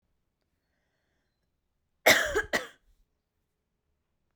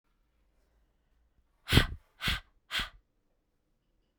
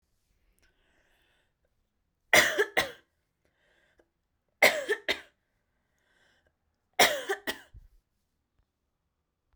{
  "cough_length": "4.4 s",
  "cough_amplitude": 16887,
  "cough_signal_mean_std_ratio": 0.22,
  "exhalation_length": "4.2 s",
  "exhalation_amplitude": 15284,
  "exhalation_signal_mean_std_ratio": 0.24,
  "three_cough_length": "9.6 s",
  "three_cough_amplitude": 18587,
  "three_cough_signal_mean_std_ratio": 0.24,
  "survey_phase": "beta (2021-08-13 to 2022-03-07)",
  "age": "18-44",
  "gender": "Female",
  "wearing_mask": "No",
  "symptom_none": true,
  "smoker_status": "Never smoked",
  "respiratory_condition_asthma": false,
  "respiratory_condition_other": false,
  "recruitment_source": "REACT",
  "submission_delay": "1 day",
  "covid_test_result": "Negative",
  "covid_test_method": "RT-qPCR"
}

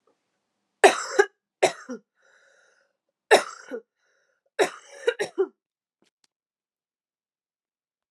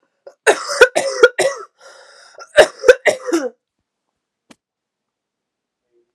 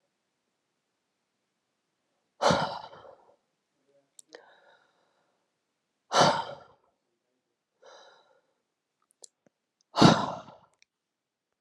{
  "three_cough_length": "8.1 s",
  "three_cough_amplitude": 27434,
  "three_cough_signal_mean_std_ratio": 0.23,
  "cough_length": "6.1 s",
  "cough_amplitude": 32768,
  "cough_signal_mean_std_ratio": 0.31,
  "exhalation_length": "11.6 s",
  "exhalation_amplitude": 21119,
  "exhalation_signal_mean_std_ratio": 0.22,
  "survey_phase": "alpha (2021-03-01 to 2021-08-12)",
  "age": "18-44",
  "gender": "Female",
  "wearing_mask": "No",
  "symptom_new_continuous_cough": true,
  "symptom_shortness_of_breath": true,
  "symptom_fatigue": true,
  "symptom_fever_high_temperature": true,
  "symptom_headache": true,
  "smoker_status": "Never smoked",
  "respiratory_condition_asthma": false,
  "respiratory_condition_other": false,
  "recruitment_source": "Test and Trace",
  "submission_delay": "2 days",
  "covid_test_result": "Positive",
  "covid_test_method": "RT-qPCR"
}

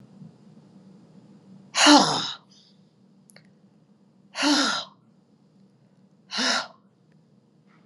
{
  "exhalation_length": "7.9 s",
  "exhalation_amplitude": 28159,
  "exhalation_signal_mean_std_ratio": 0.31,
  "survey_phase": "alpha (2021-03-01 to 2021-08-12)",
  "age": "45-64",
  "gender": "Female",
  "wearing_mask": "Yes",
  "symptom_none": true,
  "smoker_status": "Never smoked",
  "respiratory_condition_asthma": false,
  "respiratory_condition_other": false,
  "recruitment_source": "Test and Trace",
  "submission_delay": "0 days",
  "covid_test_result": "Negative",
  "covid_test_method": "LFT"
}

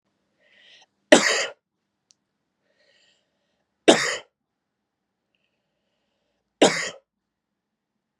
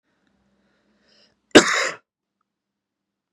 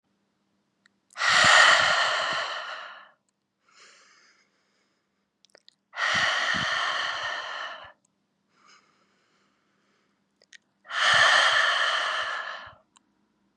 {
  "three_cough_length": "8.2 s",
  "three_cough_amplitude": 32768,
  "three_cough_signal_mean_std_ratio": 0.21,
  "cough_length": "3.3 s",
  "cough_amplitude": 32768,
  "cough_signal_mean_std_ratio": 0.19,
  "exhalation_length": "13.6 s",
  "exhalation_amplitude": 25191,
  "exhalation_signal_mean_std_ratio": 0.46,
  "survey_phase": "beta (2021-08-13 to 2022-03-07)",
  "age": "18-44",
  "gender": "Male",
  "wearing_mask": "No",
  "symptom_none": true,
  "symptom_onset": "13 days",
  "smoker_status": "Current smoker (e-cigarettes or vapes only)",
  "respiratory_condition_asthma": false,
  "respiratory_condition_other": false,
  "recruitment_source": "REACT",
  "submission_delay": "2 days",
  "covid_test_result": "Negative",
  "covid_test_method": "RT-qPCR"
}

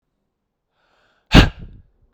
{
  "exhalation_length": "2.1 s",
  "exhalation_amplitude": 32768,
  "exhalation_signal_mean_std_ratio": 0.22,
  "survey_phase": "beta (2021-08-13 to 2022-03-07)",
  "age": "18-44",
  "gender": "Male",
  "wearing_mask": "No",
  "symptom_runny_or_blocked_nose": true,
  "symptom_onset": "4 days",
  "smoker_status": "Never smoked",
  "respiratory_condition_asthma": false,
  "respiratory_condition_other": false,
  "recruitment_source": "Test and Trace",
  "submission_delay": "2 days",
  "covid_test_result": "Positive",
  "covid_test_method": "ePCR"
}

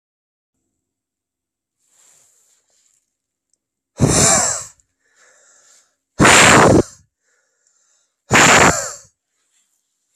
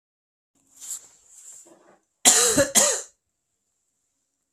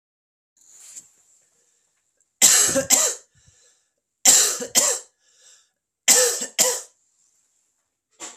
{
  "exhalation_length": "10.2 s",
  "exhalation_amplitude": 32768,
  "exhalation_signal_mean_std_ratio": 0.35,
  "cough_length": "4.5 s",
  "cough_amplitude": 28862,
  "cough_signal_mean_std_ratio": 0.32,
  "three_cough_length": "8.4 s",
  "three_cough_amplitude": 32768,
  "three_cough_signal_mean_std_ratio": 0.36,
  "survey_phase": "beta (2021-08-13 to 2022-03-07)",
  "age": "18-44",
  "gender": "Male",
  "wearing_mask": "No",
  "symptom_runny_or_blocked_nose": true,
  "symptom_headache": true,
  "symptom_onset": "3 days",
  "smoker_status": "Never smoked",
  "respiratory_condition_asthma": false,
  "respiratory_condition_other": false,
  "recruitment_source": "Test and Trace",
  "submission_delay": "2 days",
  "covid_test_result": "Positive",
  "covid_test_method": "RT-qPCR",
  "covid_ct_value": 18.0,
  "covid_ct_gene": "N gene"
}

